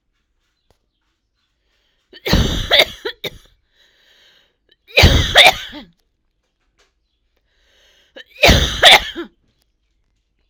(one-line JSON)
{"cough_length": "10.5 s", "cough_amplitude": 32768, "cough_signal_mean_std_ratio": 0.31, "survey_phase": "alpha (2021-03-01 to 2021-08-12)", "age": "18-44", "gender": "Female", "wearing_mask": "No", "symptom_none": true, "smoker_status": "Ex-smoker", "respiratory_condition_asthma": true, "respiratory_condition_other": false, "recruitment_source": "REACT", "submission_delay": "1 day", "covid_test_result": "Negative", "covid_test_method": "RT-qPCR"}